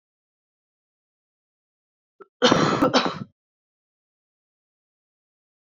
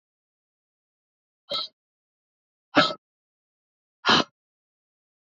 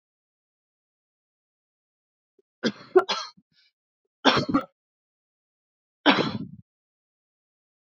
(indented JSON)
{
  "cough_length": "5.6 s",
  "cough_amplitude": 27020,
  "cough_signal_mean_std_ratio": 0.26,
  "exhalation_length": "5.4 s",
  "exhalation_amplitude": 21859,
  "exhalation_signal_mean_std_ratio": 0.21,
  "three_cough_length": "7.9 s",
  "three_cough_amplitude": 27247,
  "three_cough_signal_mean_std_ratio": 0.24,
  "survey_phase": "beta (2021-08-13 to 2022-03-07)",
  "age": "18-44",
  "gender": "Female",
  "wearing_mask": "No",
  "symptom_runny_or_blocked_nose": true,
  "symptom_fatigue": true,
  "symptom_headache": true,
  "symptom_change_to_sense_of_smell_or_taste": true,
  "symptom_onset": "3 days",
  "smoker_status": "Current smoker (e-cigarettes or vapes only)",
  "respiratory_condition_asthma": false,
  "respiratory_condition_other": false,
  "recruitment_source": "Test and Trace",
  "submission_delay": "2 days",
  "covid_test_result": "Positive",
  "covid_test_method": "RT-qPCR",
  "covid_ct_value": 17.4,
  "covid_ct_gene": "ORF1ab gene",
  "covid_ct_mean": 18.0,
  "covid_viral_load": "1300000 copies/ml",
  "covid_viral_load_category": "High viral load (>1M copies/ml)"
}